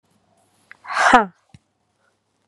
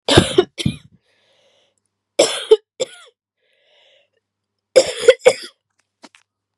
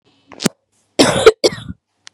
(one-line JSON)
{"exhalation_length": "2.5 s", "exhalation_amplitude": 32767, "exhalation_signal_mean_std_ratio": 0.27, "three_cough_length": "6.6 s", "three_cough_amplitude": 32768, "three_cough_signal_mean_std_ratio": 0.27, "cough_length": "2.1 s", "cough_amplitude": 32768, "cough_signal_mean_std_ratio": 0.34, "survey_phase": "beta (2021-08-13 to 2022-03-07)", "age": "18-44", "gender": "Female", "wearing_mask": "Yes", "symptom_cough_any": true, "symptom_runny_or_blocked_nose": true, "symptom_sore_throat": true, "symptom_abdominal_pain": true, "symptom_fatigue": true, "symptom_headache": true, "symptom_onset": "4 days", "smoker_status": "Never smoked", "respiratory_condition_asthma": false, "respiratory_condition_other": false, "recruitment_source": "Test and Trace", "submission_delay": "1 day", "covid_test_result": "Positive", "covid_test_method": "RT-qPCR", "covid_ct_value": 19.2, "covid_ct_gene": "ORF1ab gene", "covid_ct_mean": 19.3, "covid_viral_load": "460000 copies/ml", "covid_viral_load_category": "Low viral load (10K-1M copies/ml)"}